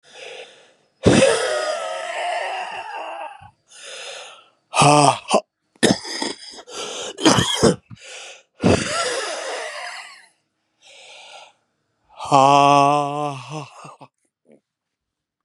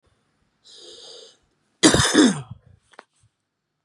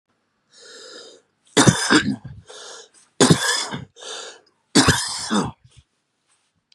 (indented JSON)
{
  "exhalation_length": "15.4 s",
  "exhalation_amplitude": 32768,
  "exhalation_signal_mean_std_ratio": 0.45,
  "cough_length": "3.8 s",
  "cough_amplitude": 28636,
  "cough_signal_mean_std_ratio": 0.31,
  "three_cough_length": "6.7 s",
  "three_cough_amplitude": 32764,
  "three_cough_signal_mean_std_ratio": 0.39,
  "survey_phase": "beta (2021-08-13 to 2022-03-07)",
  "age": "45-64",
  "gender": "Male",
  "wearing_mask": "No",
  "symptom_none": true,
  "smoker_status": "Current smoker (11 or more cigarettes per day)",
  "respiratory_condition_asthma": true,
  "respiratory_condition_other": true,
  "recruitment_source": "REACT",
  "submission_delay": "1 day",
  "covid_test_result": "Negative",
  "covid_test_method": "RT-qPCR",
  "influenza_a_test_result": "Negative",
  "influenza_b_test_result": "Negative"
}